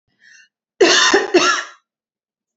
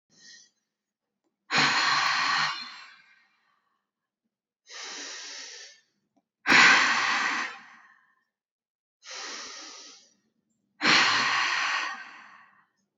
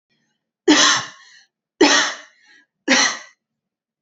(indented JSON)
{
  "cough_length": "2.6 s",
  "cough_amplitude": 31422,
  "cough_signal_mean_std_ratio": 0.45,
  "exhalation_length": "13.0 s",
  "exhalation_amplitude": 17405,
  "exhalation_signal_mean_std_ratio": 0.43,
  "three_cough_length": "4.0 s",
  "three_cough_amplitude": 29960,
  "three_cough_signal_mean_std_ratio": 0.4,
  "survey_phase": "alpha (2021-03-01 to 2021-08-12)",
  "age": "18-44",
  "gender": "Female",
  "wearing_mask": "No",
  "symptom_none": true,
  "symptom_onset": "10 days",
  "smoker_status": "Never smoked",
  "respiratory_condition_asthma": false,
  "respiratory_condition_other": false,
  "recruitment_source": "REACT",
  "submission_delay": "1 day",
  "covid_test_result": "Negative",
  "covid_test_method": "RT-qPCR"
}